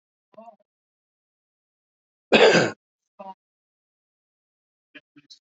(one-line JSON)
{"cough_length": "5.5 s", "cough_amplitude": 27686, "cough_signal_mean_std_ratio": 0.21, "survey_phase": "alpha (2021-03-01 to 2021-08-12)", "age": "45-64", "gender": "Male", "wearing_mask": "No", "symptom_none": true, "smoker_status": "Ex-smoker", "recruitment_source": "REACT", "submission_delay": "1 day", "covid_test_result": "Negative", "covid_test_method": "RT-qPCR"}